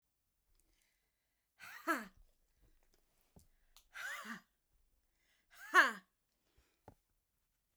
{"exhalation_length": "7.8 s", "exhalation_amplitude": 5669, "exhalation_signal_mean_std_ratio": 0.19, "survey_phase": "beta (2021-08-13 to 2022-03-07)", "age": "45-64", "gender": "Female", "wearing_mask": "No", "symptom_none": true, "smoker_status": "Never smoked", "respiratory_condition_asthma": false, "respiratory_condition_other": false, "recruitment_source": "REACT", "submission_delay": "1 day", "covid_test_result": "Negative", "covid_test_method": "RT-qPCR"}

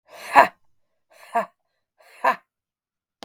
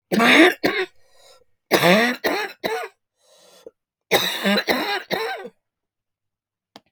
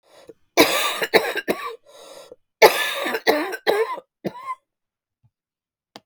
{"exhalation_length": "3.2 s", "exhalation_amplitude": 32768, "exhalation_signal_mean_std_ratio": 0.24, "three_cough_length": "6.9 s", "three_cough_amplitude": 32766, "three_cough_signal_mean_std_ratio": 0.46, "cough_length": "6.1 s", "cough_amplitude": 32768, "cough_signal_mean_std_ratio": 0.41, "survey_phase": "beta (2021-08-13 to 2022-03-07)", "age": "45-64", "gender": "Female", "wearing_mask": "No", "symptom_new_continuous_cough": true, "symptom_runny_or_blocked_nose": true, "symptom_shortness_of_breath": true, "symptom_sore_throat": true, "symptom_fatigue": true, "symptom_headache": true, "symptom_onset": "3 days", "smoker_status": "Never smoked", "respiratory_condition_asthma": false, "respiratory_condition_other": false, "recruitment_source": "Test and Trace", "submission_delay": "2 days", "covid_test_result": "Positive", "covid_test_method": "RT-qPCR", "covid_ct_value": 29.4, "covid_ct_gene": "N gene"}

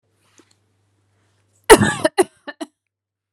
{"cough_length": "3.3 s", "cough_amplitude": 32768, "cough_signal_mean_std_ratio": 0.23, "survey_phase": "beta (2021-08-13 to 2022-03-07)", "age": "18-44", "gender": "Female", "wearing_mask": "No", "symptom_diarrhoea": true, "symptom_fatigue": true, "smoker_status": "Never smoked", "respiratory_condition_asthma": false, "respiratory_condition_other": false, "recruitment_source": "REACT", "submission_delay": "1 day", "covid_test_result": "Negative", "covid_test_method": "RT-qPCR"}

